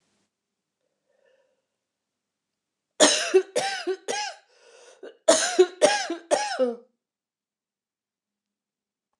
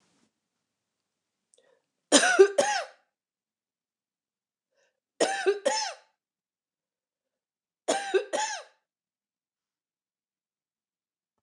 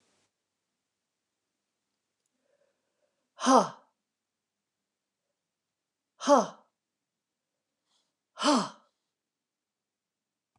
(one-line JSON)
{"cough_length": "9.2 s", "cough_amplitude": 26883, "cough_signal_mean_std_ratio": 0.33, "three_cough_length": "11.4 s", "three_cough_amplitude": 21363, "three_cough_signal_mean_std_ratio": 0.27, "exhalation_length": "10.6 s", "exhalation_amplitude": 14862, "exhalation_signal_mean_std_ratio": 0.19, "survey_phase": "beta (2021-08-13 to 2022-03-07)", "age": "45-64", "gender": "Female", "wearing_mask": "No", "symptom_cough_any": true, "symptom_runny_or_blocked_nose": true, "symptom_sore_throat": true, "symptom_fatigue": true, "symptom_headache": true, "symptom_other": true, "symptom_onset": "6 days", "smoker_status": "Ex-smoker", "respiratory_condition_asthma": false, "respiratory_condition_other": false, "recruitment_source": "Test and Trace", "submission_delay": "1 day", "covid_test_result": "Positive", "covid_test_method": "RT-qPCR", "covid_ct_value": 23.8, "covid_ct_gene": "N gene"}